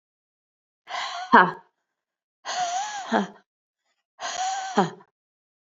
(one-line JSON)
{"exhalation_length": "5.7 s", "exhalation_amplitude": 27318, "exhalation_signal_mean_std_ratio": 0.35, "survey_phase": "beta (2021-08-13 to 2022-03-07)", "age": "18-44", "gender": "Female", "wearing_mask": "No", "symptom_cough_any": true, "symptom_new_continuous_cough": true, "symptom_runny_or_blocked_nose": true, "symptom_shortness_of_breath": true, "symptom_sore_throat": true, "symptom_abdominal_pain": true, "symptom_diarrhoea": true, "symptom_fatigue": true, "symptom_fever_high_temperature": true, "symptom_headache": true, "symptom_onset": "4 days", "smoker_status": "Never smoked", "respiratory_condition_asthma": false, "respiratory_condition_other": false, "recruitment_source": "Test and Trace", "submission_delay": "1 day", "covid_test_result": "Positive", "covid_test_method": "RT-qPCR", "covid_ct_value": 34.1, "covid_ct_gene": "ORF1ab gene", "covid_ct_mean": 34.8, "covid_viral_load": "3.7 copies/ml", "covid_viral_load_category": "Minimal viral load (< 10K copies/ml)"}